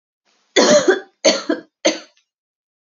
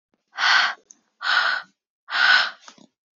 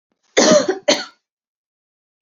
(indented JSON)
{
  "three_cough_length": "2.9 s",
  "three_cough_amplitude": 30605,
  "three_cough_signal_mean_std_ratio": 0.4,
  "exhalation_length": "3.2 s",
  "exhalation_amplitude": 21448,
  "exhalation_signal_mean_std_ratio": 0.49,
  "cough_length": "2.2 s",
  "cough_amplitude": 30211,
  "cough_signal_mean_std_ratio": 0.38,
  "survey_phase": "beta (2021-08-13 to 2022-03-07)",
  "age": "18-44",
  "gender": "Female",
  "wearing_mask": "No",
  "symptom_fatigue": true,
  "symptom_headache": true,
  "smoker_status": "Never smoked",
  "respiratory_condition_asthma": false,
  "respiratory_condition_other": false,
  "recruitment_source": "REACT",
  "submission_delay": "2 days",
  "covid_test_result": "Negative",
  "covid_test_method": "RT-qPCR",
  "influenza_a_test_result": "Negative",
  "influenza_b_test_result": "Negative"
}